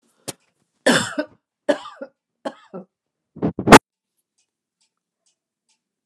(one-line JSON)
{"three_cough_length": "6.1 s", "three_cough_amplitude": 32768, "three_cough_signal_mean_std_ratio": 0.2, "survey_phase": "alpha (2021-03-01 to 2021-08-12)", "age": "65+", "gender": "Female", "wearing_mask": "No", "symptom_none": true, "smoker_status": "Ex-smoker", "respiratory_condition_asthma": false, "respiratory_condition_other": false, "recruitment_source": "REACT", "submission_delay": "1 day", "covid_test_result": "Negative", "covid_test_method": "RT-qPCR"}